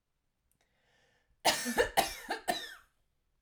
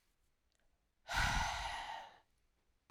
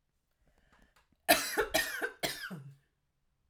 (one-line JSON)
{"three_cough_length": "3.4 s", "three_cough_amplitude": 9043, "three_cough_signal_mean_std_ratio": 0.36, "exhalation_length": "2.9 s", "exhalation_amplitude": 2598, "exhalation_signal_mean_std_ratio": 0.46, "cough_length": "3.5 s", "cough_amplitude": 9771, "cough_signal_mean_std_ratio": 0.37, "survey_phase": "alpha (2021-03-01 to 2021-08-12)", "age": "18-44", "gender": "Female", "wearing_mask": "No", "symptom_none": true, "smoker_status": "Current smoker (1 to 10 cigarettes per day)", "respiratory_condition_asthma": false, "respiratory_condition_other": false, "recruitment_source": "REACT", "submission_delay": "3 days", "covid_test_result": "Negative", "covid_test_method": "RT-qPCR"}